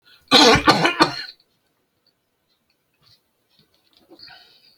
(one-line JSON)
{"cough_length": "4.8 s", "cough_amplitude": 32768, "cough_signal_mean_std_ratio": 0.3, "survey_phase": "beta (2021-08-13 to 2022-03-07)", "age": "65+", "gender": "Male", "wearing_mask": "No", "symptom_none": true, "smoker_status": "Ex-smoker", "respiratory_condition_asthma": false, "respiratory_condition_other": false, "recruitment_source": "REACT", "submission_delay": "1 day", "covid_test_result": "Negative", "covid_test_method": "RT-qPCR"}